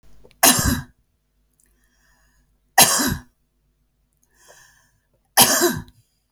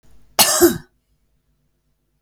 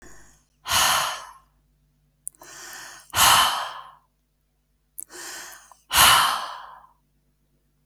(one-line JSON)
{"three_cough_length": "6.3 s", "three_cough_amplitude": 32768, "three_cough_signal_mean_std_ratio": 0.32, "cough_length": "2.2 s", "cough_amplitude": 32768, "cough_signal_mean_std_ratio": 0.31, "exhalation_length": "7.9 s", "exhalation_amplitude": 24947, "exhalation_signal_mean_std_ratio": 0.38, "survey_phase": "beta (2021-08-13 to 2022-03-07)", "age": "45-64", "gender": "Female", "wearing_mask": "No", "symptom_none": true, "smoker_status": "Never smoked", "respiratory_condition_asthma": true, "respiratory_condition_other": false, "recruitment_source": "REACT", "submission_delay": "4 days", "covid_test_result": "Negative", "covid_test_method": "RT-qPCR", "influenza_a_test_result": "Negative", "influenza_b_test_result": "Negative"}